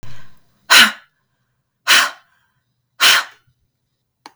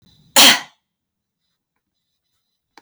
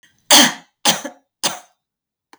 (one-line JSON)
{"exhalation_length": "4.4 s", "exhalation_amplitude": 32768, "exhalation_signal_mean_std_ratio": 0.34, "cough_length": "2.8 s", "cough_amplitude": 32768, "cough_signal_mean_std_ratio": 0.23, "three_cough_length": "2.4 s", "three_cough_amplitude": 32768, "three_cough_signal_mean_std_ratio": 0.33, "survey_phase": "beta (2021-08-13 to 2022-03-07)", "age": "45-64", "gender": "Female", "wearing_mask": "Yes", "symptom_none": true, "smoker_status": "Never smoked", "respiratory_condition_asthma": false, "respiratory_condition_other": false, "recruitment_source": "REACT", "submission_delay": "0 days", "covid_test_result": "Negative", "covid_test_method": "RT-qPCR"}